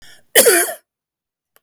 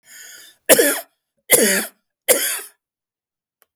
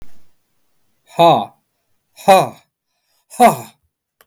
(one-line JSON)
{"cough_length": "1.6 s", "cough_amplitude": 32768, "cough_signal_mean_std_ratio": 0.38, "three_cough_length": "3.8 s", "three_cough_amplitude": 32768, "three_cough_signal_mean_std_ratio": 0.38, "exhalation_length": "4.3 s", "exhalation_amplitude": 32768, "exhalation_signal_mean_std_ratio": 0.32, "survey_phase": "beta (2021-08-13 to 2022-03-07)", "age": "45-64", "gender": "Male", "wearing_mask": "No", "symptom_none": true, "smoker_status": "Never smoked", "respiratory_condition_asthma": false, "respiratory_condition_other": true, "recruitment_source": "REACT", "submission_delay": "1 day", "covid_test_result": "Negative", "covid_test_method": "RT-qPCR"}